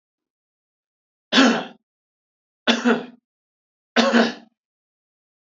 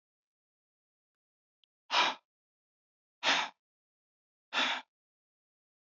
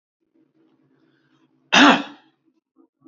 {"three_cough_length": "5.5 s", "three_cough_amplitude": 27737, "three_cough_signal_mean_std_ratio": 0.33, "exhalation_length": "5.8 s", "exhalation_amplitude": 6557, "exhalation_signal_mean_std_ratio": 0.27, "cough_length": "3.1 s", "cough_amplitude": 27636, "cough_signal_mean_std_ratio": 0.24, "survey_phase": "beta (2021-08-13 to 2022-03-07)", "age": "45-64", "gender": "Male", "wearing_mask": "No", "symptom_none": true, "smoker_status": "Never smoked", "respiratory_condition_asthma": false, "respiratory_condition_other": false, "recruitment_source": "REACT", "submission_delay": "3 days", "covid_test_result": "Negative", "covid_test_method": "RT-qPCR", "influenza_a_test_result": "Negative", "influenza_b_test_result": "Negative"}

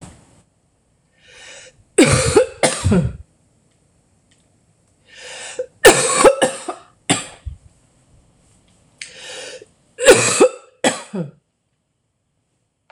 {"three_cough_length": "12.9 s", "three_cough_amplitude": 26028, "three_cough_signal_mean_std_ratio": 0.35, "survey_phase": "beta (2021-08-13 to 2022-03-07)", "age": "45-64", "gender": "Female", "wearing_mask": "No", "symptom_cough_any": true, "symptom_runny_or_blocked_nose": true, "symptom_onset": "11 days", "smoker_status": "Never smoked", "respiratory_condition_asthma": false, "respiratory_condition_other": false, "recruitment_source": "REACT", "submission_delay": "3 days", "covid_test_result": "Negative", "covid_test_method": "RT-qPCR", "influenza_a_test_result": "Negative", "influenza_b_test_result": "Negative"}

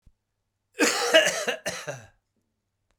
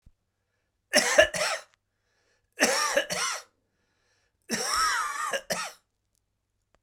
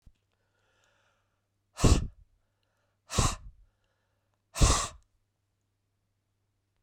{"cough_length": "3.0 s", "cough_amplitude": 19862, "cough_signal_mean_std_ratio": 0.4, "three_cough_length": "6.8 s", "three_cough_amplitude": 20806, "three_cough_signal_mean_std_ratio": 0.44, "exhalation_length": "6.8 s", "exhalation_amplitude": 12595, "exhalation_signal_mean_std_ratio": 0.25, "survey_phase": "beta (2021-08-13 to 2022-03-07)", "age": "45-64", "gender": "Male", "wearing_mask": "No", "symptom_cough_any": true, "symptom_runny_or_blocked_nose": true, "symptom_abdominal_pain": true, "symptom_diarrhoea": true, "symptom_fatigue": true, "symptom_fever_high_temperature": true, "symptom_onset": "4 days", "smoker_status": "Ex-smoker", "respiratory_condition_asthma": true, "respiratory_condition_other": true, "recruitment_source": "Test and Trace", "submission_delay": "1 day", "covid_test_result": "Positive", "covid_test_method": "RT-qPCR", "covid_ct_value": 19.1, "covid_ct_gene": "ORF1ab gene"}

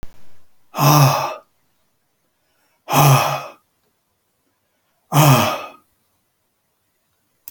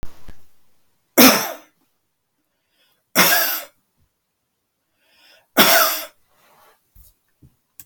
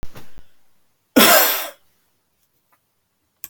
{"exhalation_length": "7.5 s", "exhalation_amplitude": 32629, "exhalation_signal_mean_std_ratio": 0.38, "three_cough_length": "7.9 s", "three_cough_amplitude": 32768, "three_cough_signal_mean_std_ratio": 0.32, "cough_length": "3.5 s", "cough_amplitude": 32768, "cough_signal_mean_std_ratio": 0.34, "survey_phase": "beta (2021-08-13 to 2022-03-07)", "age": "65+", "gender": "Male", "wearing_mask": "No", "symptom_none": true, "smoker_status": "Ex-smoker", "respiratory_condition_asthma": false, "respiratory_condition_other": false, "recruitment_source": "REACT", "submission_delay": "2 days", "covid_test_result": "Negative", "covid_test_method": "RT-qPCR"}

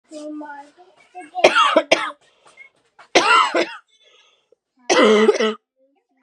{"three_cough_length": "6.2 s", "three_cough_amplitude": 32768, "three_cough_signal_mean_std_ratio": 0.44, "survey_phase": "beta (2021-08-13 to 2022-03-07)", "age": "18-44", "gender": "Female", "wearing_mask": "No", "symptom_cough_any": true, "symptom_runny_or_blocked_nose": true, "symptom_sore_throat": true, "symptom_fatigue": true, "symptom_fever_high_temperature": true, "symptom_headache": true, "symptom_onset": "2 days", "smoker_status": "Never smoked", "respiratory_condition_asthma": false, "respiratory_condition_other": false, "recruitment_source": "Test and Trace", "submission_delay": "1 day", "covid_test_result": "Positive", "covid_test_method": "ePCR"}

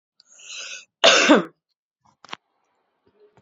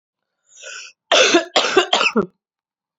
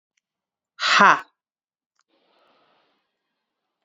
{"cough_length": "3.4 s", "cough_amplitude": 31126, "cough_signal_mean_std_ratio": 0.29, "three_cough_length": "3.0 s", "three_cough_amplitude": 29434, "three_cough_signal_mean_std_ratio": 0.45, "exhalation_length": "3.8 s", "exhalation_amplitude": 32767, "exhalation_signal_mean_std_ratio": 0.22, "survey_phase": "alpha (2021-03-01 to 2021-08-12)", "age": "18-44", "gender": "Female", "wearing_mask": "No", "symptom_cough_any": true, "symptom_new_continuous_cough": true, "symptom_fatigue": true, "symptom_fever_high_temperature": true, "symptom_headache": true, "smoker_status": "Never smoked", "respiratory_condition_asthma": false, "respiratory_condition_other": false, "recruitment_source": "Test and Trace", "submission_delay": "1 day", "covid_test_result": "Positive", "covid_test_method": "RT-qPCR"}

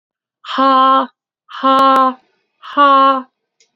{"exhalation_length": "3.8 s", "exhalation_amplitude": 28633, "exhalation_signal_mean_std_ratio": 0.56, "survey_phase": "beta (2021-08-13 to 2022-03-07)", "age": "18-44", "gender": "Female", "wearing_mask": "No", "symptom_cough_any": true, "symptom_runny_or_blocked_nose": true, "symptom_fever_high_temperature": true, "symptom_other": true, "symptom_onset": "3 days", "smoker_status": "Never smoked", "respiratory_condition_asthma": false, "respiratory_condition_other": false, "recruitment_source": "Test and Trace", "submission_delay": "1 day", "covid_test_result": "Positive", "covid_test_method": "RT-qPCR", "covid_ct_value": 35.9, "covid_ct_gene": "N gene"}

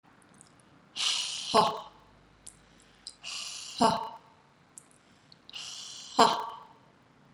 {"exhalation_length": "7.3 s", "exhalation_amplitude": 15308, "exhalation_signal_mean_std_ratio": 0.35, "survey_phase": "beta (2021-08-13 to 2022-03-07)", "age": "18-44", "gender": "Female", "wearing_mask": "No", "symptom_none": true, "smoker_status": "Never smoked", "respiratory_condition_asthma": false, "respiratory_condition_other": false, "recruitment_source": "REACT", "submission_delay": "1 day", "covid_test_result": "Negative", "covid_test_method": "RT-qPCR"}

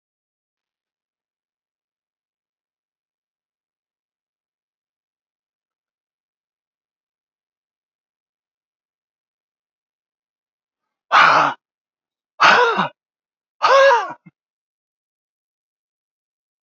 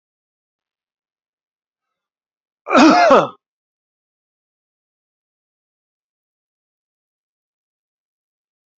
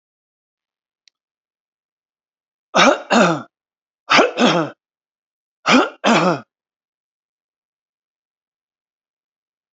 {"exhalation_length": "16.6 s", "exhalation_amplitude": 31103, "exhalation_signal_mean_std_ratio": 0.22, "cough_length": "8.8 s", "cough_amplitude": 29655, "cough_signal_mean_std_ratio": 0.2, "three_cough_length": "9.7 s", "three_cough_amplitude": 31063, "three_cough_signal_mean_std_ratio": 0.31, "survey_phase": "beta (2021-08-13 to 2022-03-07)", "age": "65+", "gender": "Male", "wearing_mask": "No", "symptom_none": true, "smoker_status": "Ex-smoker", "respiratory_condition_asthma": false, "respiratory_condition_other": false, "recruitment_source": "REACT", "submission_delay": "1 day", "covid_test_result": "Negative", "covid_test_method": "RT-qPCR"}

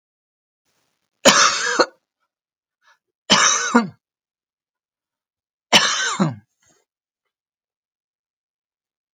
{"three_cough_length": "9.1 s", "three_cough_amplitude": 32768, "three_cough_signal_mean_std_ratio": 0.32, "survey_phase": "alpha (2021-03-01 to 2021-08-12)", "age": "65+", "gender": "Female", "wearing_mask": "No", "symptom_none": true, "smoker_status": "Ex-smoker", "respiratory_condition_asthma": false, "respiratory_condition_other": false, "recruitment_source": "REACT", "submission_delay": "1 day", "covid_test_result": "Negative", "covid_test_method": "RT-qPCR"}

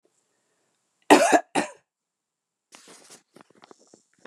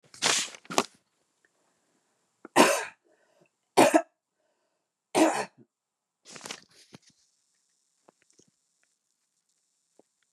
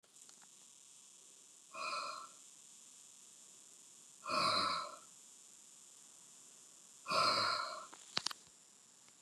{"cough_length": "4.3 s", "cough_amplitude": 28901, "cough_signal_mean_std_ratio": 0.22, "three_cough_length": "10.3 s", "three_cough_amplitude": 21719, "three_cough_signal_mean_std_ratio": 0.24, "exhalation_length": "9.2 s", "exhalation_amplitude": 7897, "exhalation_signal_mean_std_ratio": 0.42, "survey_phase": "beta (2021-08-13 to 2022-03-07)", "age": "65+", "gender": "Female", "wearing_mask": "No", "symptom_cough_any": true, "symptom_sore_throat": true, "symptom_headache": true, "symptom_onset": "3 days", "smoker_status": "Never smoked", "respiratory_condition_asthma": false, "respiratory_condition_other": false, "recruitment_source": "Test and Trace", "submission_delay": "2 days", "covid_test_result": "Positive", "covid_test_method": "RT-qPCR", "covid_ct_value": 26.9, "covid_ct_gene": "N gene"}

